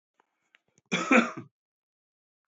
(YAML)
cough_length: 2.5 s
cough_amplitude: 13703
cough_signal_mean_std_ratio: 0.27
survey_phase: beta (2021-08-13 to 2022-03-07)
age: 45-64
gender: Male
wearing_mask: 'No'
symptom_cough_any: true
symptom_runny_or_blocked_nose: true
symptom_shortness_of_breath: true
symptom_sore_throat: true
symptom_fever_high_temperature: true
symptom_headache: true
symptom_onset: 3 days
smoker_status: Ex-smoker
respiratory_condition_asthma: false
respiratory_condition_other: false
recruitment_source: Test and Trace
submission_delay: 2 days
covid_test_result: Positive
covid_test_method: RT-qPCR
covid_ct_value: 15.2
covid_ct_gene: ORF1ab gene
covid_ct_mean: 15.5
covid_viral_load: 8100000 copies/ml
covid_viral_load_category: High viral load (>1M copies/ml)